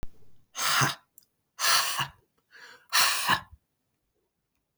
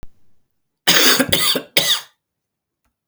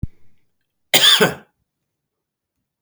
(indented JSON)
{
  "exhalation_length": "4.8 s",
  "exhalation_amplitude": 11846,
  "exhalation_signal_mean_std_ratio": 0.45,
  "three_cough_length": "3.1 s",
  "three_cough_amplitude": 32768,
  "three_cough_signal_mean_std_ratio": 0.45,
  "cough_length": "2.8 s",
  "cough_amplitude": 32768,
  "cough_signal_mean_std_ratio": 0.31,
  "survey_phase": "beta (2021-08-13 to 2022-03-07)",
  "age": "45-64",
  "gender": "Male",
  "wearing_mask": "No",
  "symptom_none": true,
  "smoker_status": "Ex-smoker",
  "respiratory_condition_asthma": false,
  "respiratory_condition_other": false,
  "recruitment_source": "REACT",
  "submission_delay": "3 days",
  "covid_test_result": "Negative",
  "covid_test_method": "RT-qPCR"
}